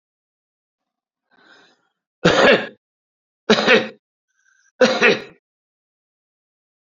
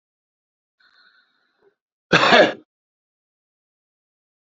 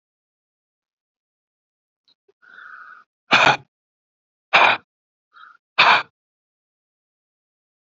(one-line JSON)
{"three_cough_length": "6.8 s", "three_cough_amplitude": 32768, "three_cough_signal_mean_std_ratio": 0.31, "cough_length": "4.4 s", "cough_amplitude": 28632, "cough_signal_mean_std_ratio": 0.23, "exhalation_length": "7.9 s", "exhalation_amplitude": 29657, "exhalation_signal_mean_std_ratio": 0.24, "survey_phase": "beta (2021-08-13 to 2022-03-07)", "age": "65+", "gender": "Male", "wearing_mask": "No", "symptom_none": true, "smoker_status": "Never smoked", "respiratory_condition_asthma": true, "respiratory_condition_other": false, "recruitment_source": "REACT", "submission_delay": "2 days", "covid_test_result": "Negative", "covid_test_method": "RT-qPCR", "influenza_a_test_result": "Negative", "influenza_b_test_result": "Negative"}